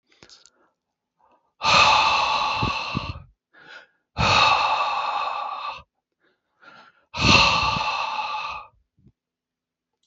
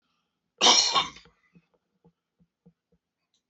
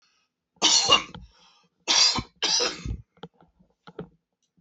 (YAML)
exhalation_length: 10.1 s
exhalation_amplitude: 28191
exhalation_signal_mean_std_ratio: 0.53
cough_length: 3.5 s
cough_amplitude: 17972
cough_signal_mean_std_ratio: 0.27
three_cough_length: 4.6 s
three_cough_amplitude: 19258
three_cough_signal_mean_std_ratio: 0.41
survey_phase: beta (2021-08-13 to 2022-03-07)
age: 45-64
gender: Male
wearing_mask: 'No'
symptom_none: true
smoker_status: Current smoker (1 to 10 cigarettes per day)
respiratory_condition_asthma: false
respiratory_condition_other: false
recruitment_source: REACT
submission_delay: 1 day
covid_test_result: Negative
covid_test_method: RT-qPCR